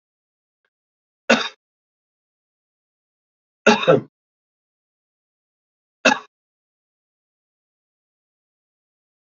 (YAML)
three_cough_length: 9.4 s
three_cough_amplitude: 29016
three_cough_signal_mean_std_ratio: 0.18
survey_phase: beta (2021-08-13 to 2022-03-07)
age: 45-64
gender: Male
wearing_mask: 'No'
symptom_cough_any: true
symptom_runny_or_blocked_nose: true
symptom_fatigue: true
symptom_change_to_sense_of_smell_or_taste: true
smoker_status: Never smoked
respiratory_condition_asthma: false
respiratory_condition_other: false
recruitment_source: Test and Trace
submission_delay: 2 days
covid_test_result: Positive
covid_test_method: RT-qPCR
covid_ct_value: 11.7
covid_ct_gene: ORF1ab gene
covid_ct_mean: 12.0
covid_viral_load: 110000000 copies/ml
covid_viral_load_category: High viral load (>1M copies/ml)